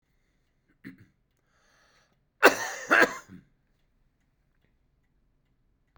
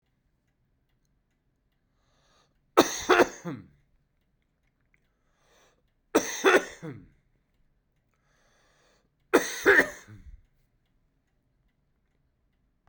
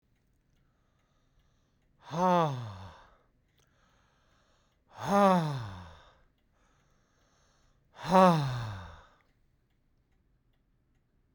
{"cough_length": "6.0 s", "cough_amplitude": 29268, "cough_signal_mean_std_ratio": 0.2, "three_cough_length": "12.9 s", "three_cough_amplitude": 22458, "three_cough_signal_mean_std_ratio": 0.23, "exhalation_length": "11.3 s", "exhalation_amplitude": 11084, "exhalation_signal_mean_std_ratio": 0.32, "survey_phase": "beta (2021-08-13 to 2022-03-07)", "age": "65+", "gender": "Male", "wearing_mask": "No", "symptom_none": true, "symptom_onset": "4 days", "smoker_status": "Never smoked", "respiratory_condition_asthma": false, "respiratory_condition_other": false, "recruitment_source": "REACT", "submission_delay": "2 days", "covid_test_result": "Negative", "covid_test_method": "RT-qPCR", "influenza_a_test_result": "Negative", "influenza_b_test_result": "Negative"}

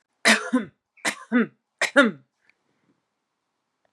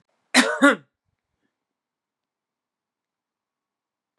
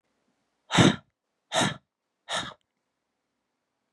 {"three_cough_length": "3.9 s", "three_cough_amplitude": 26495, "three_cough_signal_mean_std_ratio": 0.33, "cough_length": "4.2 s", "cough_amplitude": 29933, "cough_signal_mean_std_ratio": 0.21, "exhalation_length": "3.9 s", "exhalation_amplitude": 18361, "exhalation_signal_mean_std_ratio": 0.27, "survey_phase": "beta (2021-08-13 to 2022-03-07)", "age": "18-44", "gender": "Female", "wearing_mask": "No", "symptom_cough_any": true, "symptom_runny_or_blocked_nose": true, "symptom_fatigue": true, "symptom_headache": true, "smoker_status": "Never smoked", "respiratory_condition_asthma": false, "respiratory_condition_other": false, "recruitment_source": "Test and Trace", "submission_delay": "1 day", "covid_test_result": "Positive", "covid_test_method": "LFT"}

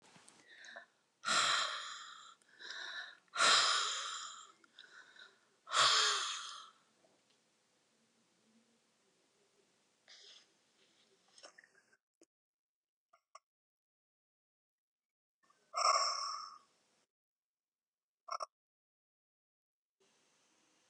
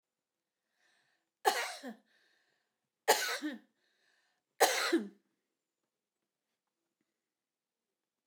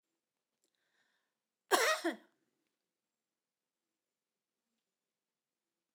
{"exhalation_length": "20.9 s", "exhalation_amplitude": 5055, "exhalation_signal_mean_std_ratio": 0.31, "three_cough_length": "8.3 s", "three_cough_amplitude": 9295, "three_cough_signal_mean_std_ratio": 0.26, "cough_length": "5.9 s", "cough_amplitude": 7533, "cough_signal_mean_std_ratio": 0.19, "survey_phase": "alpha (2021-03-01 to 2021-08-12)", "age": "65+", "gender": "Female", "wearing_mask": "No", "symptom_none": true, "smoker_status": "Ex-smoker", "respiratory_condition_asthma": false, "respiratory_condition_other": false, "recruitment_source": "REACT", "submission_delay": "1 day", "covid_test_result": "Negative", "covid_test_method": "RT-qPCR"}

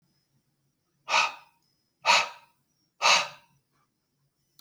{"exhalation_length": "4.6 s", "exhalation_amplitude": 14206, "exhalation_signal_mean_std_ratio": 0.3, "survey_phase": "alpha (2021-03-01 to 2021-08-12)", "age": "45-64", "gender": "Male", "wearing_mask": "No", "symptom_none": true, "smoker_status": "Never smoked", "respiratory_condition_asthma": false, "respiratory_condition_other": false, "recruitment_source": "REACT", "submission_delay": "2 days", "covid_test_result": "Negative", "covid_test_method": "RT-qPCR"}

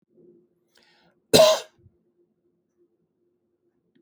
{"cough_length": "4.0 s", "cough_amplitude": 29250, "cough_signal_mean_std_ratio": 0.21, "survey_phase": "alpha (2021-03-01 to 2021-08-12)", "age": "45-64", "gender": "Male", "wearing_mask": "No", "symptom_none": true, "smoker_status": "Never smoked", "respiratory_condition_asthma": false, "respiratory_condition_other": false, "recruitment_source": "REACT", "submission_delay": "1 day", "covid_test_result": "Negative", "covid_test_method": "RT-qPCR"}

